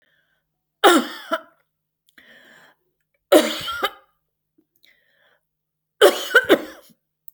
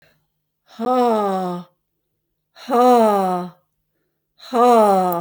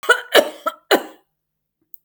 {"three_cough_length": "7.3 s", "three_cough_amplitude": 30491, "three_cough_signal_mean_std_ratio": 0.28, "exhalation_length": "5.2 s", "exhalation_amplitude": 22441, "exhalation_signal_mean_std_ratio": 0.57, "cough_length": "2.0 s", "cough_amplitude": 31445, "cough_signal_mean_std_ratio": 0.33, "survey_phase": "beta (2021-08-13 to 2022-03-07)", "age": "65+", "gender": "Female", "wearing_mask": "No", "symptom_none": true, "smoker_status": "Ex-smoker", "respiratory_condition_asthma": false, "respiratory_condition_other": false, "recruitment_source": "REACT", "submission_delay": "2 days", "covid_test_result": "Negative", "covid_test_method": "RT-qPCR"}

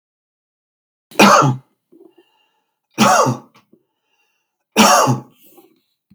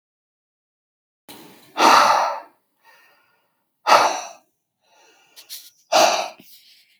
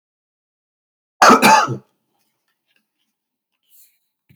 {"three_cough_length": "6.1 s", "three_cough_amplitude": 32768, "three_cough_signal_mean_std_ratio": 0.36, "exhalation_length": "7.0 s", "exhalation_amplitude": 32768, "exhalation_signal_mean_std_ratio": 0.34, "cough_length": "4.4 s", "cough_amplitude": 32768, "cough_signal_mean_std_ratio": 0.26, "survey_phase": "beta (2021-08-13 to 2022-03-07)", "age": "45-64", "gender": "Male", "wearing_mask": "No", "symptom_none": true, "smoker_status": "Ex-smoker", "respiratory_condition_asthma": false, "respiratory_condition_other": false, "recruitment_source": "REACT", "submission_delay": "5 days", "covid_test_result": "Negative", "covid_test_method": "RT-qPCR", "influenza_a_test_result": "Negative", "influenza_b_test_result": "Negative"}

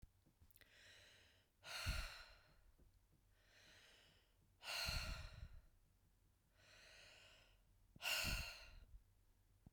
{"exhalation_length": "9.7 s", "exhalation_amplitude": 860, "exhalation_signal_mean_std_ratio": 0.44, "survey_phase": "beta (2021-08-13 to 2022-03-07)", "age": "45-64", "gender": "Female", "wearing_mask": "No", "symptom_none": true, "smoker_status": "Never smoked", "respiratory_condition_asthma": false, "respiratory_condition_other": false, "recruitment_source": "REACT", "submission_delay": "0 days", "covid_test_result": "Negative", "covid_test_method": "RT-qPCR"}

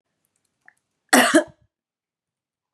{"cough_length": "2.7 s", "cough_amplitude": 32241, "cough_signal_mean_std_ratio": 0.25, "survey_phase": "beta (2021-08-13 to 2022-03-07)", "age": "18-44", "gender": "Female", "wearing_mask": "No", "symptom_cough_any": true, "symptom_runny_or_blocked_nose": true, "symptom_sore_throat": true, "symptom_headache": true, "smoker_status": "Never smoked", "respiratory_condition_asthma": false, "respiratory_condition_other": false, "recruitment_source": "Test and Trace", "submission_delay": "2 days", "covid_test_result": "Positive", "covid_test_method": "RT-qPCR", "covid_ct_value": 19.1, "covid_ct_gene": "ORF1ab gene"}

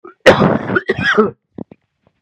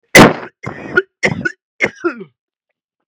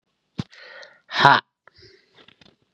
{"cough_length": "2.2 s", "cough_amplitude": 32768, "cough_signal_mean_std_ratio": 0.48, "three_cough_length": "3.1 s", "three_cough_amplitude": 32768, "three_cough_signal_mean_std_ratio": 0.34, "exhalation_length": "2.7 s", "exhalation_amplitude": 32768, "exhalation_signal_mean_std_ratio": 0.23, "survey_phase": "beta (2021-08-13 to 2022-03-07)", "age": "45-64", "gender": "Male", "wearing_mask": "No", "symptom_cough_any": true, "symptom_runny_or_blocked_nose": true, "symptom_sore_throat": true, "symptom_fatigue": true, "symptom_headache": true, "symptom_change_to_sense_of_smell_or_taste": true, "smoker_status": "Never smoked", "respiratory_condition_asthma": false, "respiratory_condition_other": false, "recruitment_source": "Test and Trace", "submission_delay": "1 day", "covid_test_result": "Positive", "covid_test_method": "LFT"}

